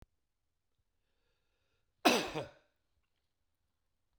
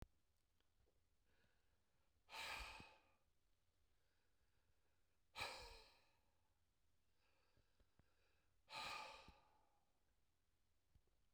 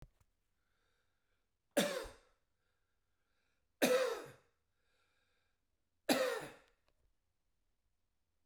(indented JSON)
{
  "cough_length": "4.2 s",
  "cough_amplitude": 8432,
  "cough_signal_mean_std_ratio": 0.2,
  "exhalation_length": "11.3 s",
  "exhalation_amplitude": 510,
  "exhalation_signal_mean_std_ratio": 0.39,
  "three_cough_length": "8.5 s",
  "three_cough_amplitude": 6200,
  "three_cough_signal_mean_std_ratio": 0.28,
  "survey_phase": "beta (2021-08-13 to 2022-03-07)",
  "age": "65+",
  "gender": "Male",
  "wearing_mask": "No",
  "symptom_none": true,
  "smoker_status": "Never smoked",
  "respiratory_condition_asthma": false,
  "respiratory_condition_other": false,
  "recruitment_source": "REACT",
  "submission_delay": "0 days",
  "covid_test_result": "Negative",
  "covid_test_method": "RT-qPCR"
}